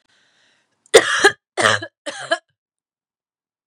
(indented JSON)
{
  "three_cough_length": "3.7 s",
  "three_cough_amplitude": 32768,
  "three_cough_signal_mean_std_ratio": 0.29,
  "survey_phase": "beta (2021-08-13 to 2022-03-07)",
  "age": "18-44",
  "gender": "Female",
  "wearing_mask": "No",
  "symptom_cough_any": true,
  "symptom_runny_or_blocked_nose": true,
  "symptom_fatigue": true,
  "symptom_headache": true,
  "symptom_other": true,
  "symptom_onset": "3 days",
  "smoker_status": "Prefer not to say",
  "respiratory_condition_asthma": false,
  "respiratory_condition_other": false,
  "recruitment_source": "Test and Trace",
  "submission_delay": "2 days",
  "covid_test_result": "Positive",
  "covid_test_method": "RT-qPCR"
}